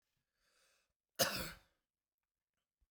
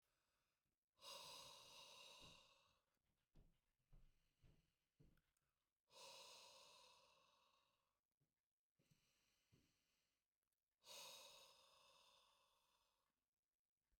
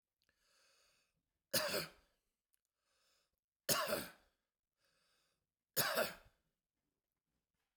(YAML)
cough_length: 2.9 s
cough_amplitude: 4522
cough_signal_mean_std_ratio: 0.23
exhalation_length: 14.0 s
exhalation_amplitude: 144
exhalation_signal_mean_std_ratio: 0.5
three_cough_length: 7.8 s
three_cough_amplitude: 3356
three_cough_signal_mean_std_ratio: 0.29
survey_phase: beta (2021-08-13 to 2022-03-07)
age: 45-64
gender: Male
wearing_mask: 'No'
symptom_headache: true
smoker_status: Ex-smoker
respiratory_condition_asthma: false
respiratory_condition_other: false
recruitment_source: REACT
submission_delay: 1 day
covid_test_result: Negative
covid_test_method: RT-qPCR